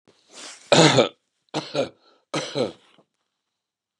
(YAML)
exhalation_length: 4.0 s
exhalation_amplitude: 29559
exhalation_signal_mean_std_ratio: 0.33
survey_phase: beta (2021-08-13 to 2022-03-07)
age: 65+
gender: Male
wearing_mask: 'No'
symptom_cough_any: true
smoker_status: Never smoked
respiratory_condition_asthma: false
respiratory_condition_other: false
recruitment_source: REACT
submission_delay: 2 days
covid_test_result: Negative
covid_test_method: RT-qPCR
influenza_a_test_result: Negative
influenza_b_test_result: Negative